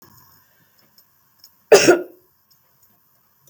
cough_length: 3.5 s
cough_amplitude: 32768
cough_signal_mean_std_ratio: 0.22
survey_phase: beta (2021-08-13 to 2022-03-07)
age: 45-64
gender: Female
wearing_mask: 'No'
symptom_none: true
smoker_status: Ex-smoker
respiratory_condition_asthma: false
respiratory_condition_other: false
recruitment_source: REACT
submission_delay: 1 day
covid_test_result: Negative
covid_test_method: RT-qPCR
influenza_a_test_result: Negative
influenza_b_test_result: Negative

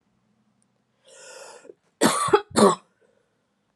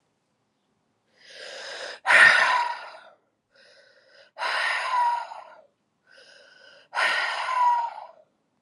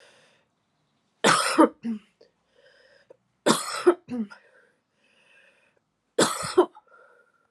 cough_length: 3.8 s
cough_amplitude: 23168
cough_signal_mean_std_ratio: 0.3
exhalation_length: 8.6 s
exhalation_amplitude: 22570
exhalation_signal_mean_std_ratio: 0.45
three_cough_length: 7.5 s
three_cough_amplitude: 25671
three_cough_signal_mean_std_ratio: 0.31
survey_phase: alpha (2021-03-01 to 2021-08-12)
age: 45-64
gender: Female
wearing_mask: 'No'
symptom_none: true
smoker_status: Never smoked
respiratory_condition_asthma: true
respiratory_condition_other: false
recruitment_source: Test and Trace
submission_delay: 2 days
covid_test_result: Positive
covid_test_method: RT-qPCR
covid_ct_value: 16.7
covid_ct_gene: ORF1ab gene
covid_ct_mean: 16.7
covid_viral_load: 3200000 copies/ml
covid_viral_load_category: High viral load (>1M copies/ml)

